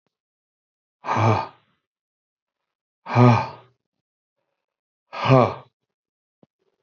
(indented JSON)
{
  "exhalation_length": "6.8 s",
  "exhalation_amplitude": 27494,
  "exhalation_signal_mean_std_ratio": 0.29,
  "survey_phase": "beta (2021-08-13 to 2022-03-07)",
  "age": "45-64",
  "gender": "Male",
  "wearing_mask": "No",
  "symptom_cough_any": true,
  "smoker_status": "Ex-smoker",
  "respiratory_condition_asthma": false,
  "respiratory_condition_other": false,
  "recruitment_source": "REACT",
  "submission_delay": "1 day",
  "covid_test_result": "Negative",
  "covid_test_method": "RT-qPCR"
}